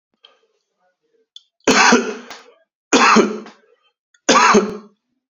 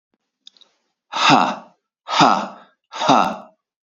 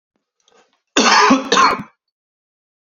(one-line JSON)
{"three_cough_length": "5.3 s", "three_cough_amplitude": 30887, "three_cough_signal_mean_std_ratio": 0.41, "exhalation_length": "3.8 s", "exhalation_amplitude": 30886, "exhalation_signal_mean_std_ratio": 0.41, "cough_length": "2.9 s", "cough_amplitude": 29528, "cough_signal_mean_std_ratio": 0.43, "survey_phase": "beta (2021-08-13 to 2022-03-07)", "age": "18-44", "gender": "Male", "wearing_mask": "No", "symptom_runny_or_blocked_nose": true, "smoker_status": "Never smoked", "respiratory_condition_asthma": false, "respiratory_condition_other": false, "recruitment_source": "REACT", "submission_delay": "2 days", "covid_test_result": "Negative", "covid_test_method": "RT-qPCR", "influenza_a_test_result": "Negative", "influenza_b_test_result": "Negative"}